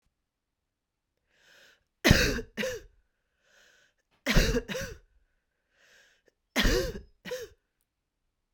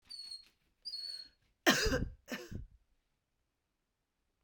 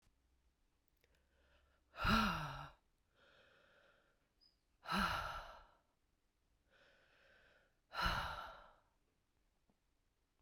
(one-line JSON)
{"three_cough_length": "8.5 s", "three_cough_amplitude": 21576, "three_cough_signal_mean_std_ratio": 0.31, "cough_length": "4.4 s", "cough_amplitude": 7992, "cough_signal_mean_std_ratio": 0.34, "exhalation_length": "10.4 s", "exhalation_amplitude": 2487, "exhalation_signal_mean_std_ratio": 0.33, "survey_phase": "beta (2021-08-13 to 2022-03-07)", "age": "45-64", "gender": "Female", "wearing_mask": "No", "symptom_cough_any": true, "symptom_runny_or_blocked_nose": true, "symptom_abdominal_pain": true, "symptom_fever_high_temperature": true, "symptom_change_to_sense_of_smell_or_taste": true, "symptom_onset": "2 days", "smoker_status": "Never smoked", "respiratory_condition_asthma": false, "respiratory_condition_other": false, "recruitment_source": "Test and Trace", "submission_delay": "2 days", "covid_test_result": "Positive", "covid_test_method": "LAMP"}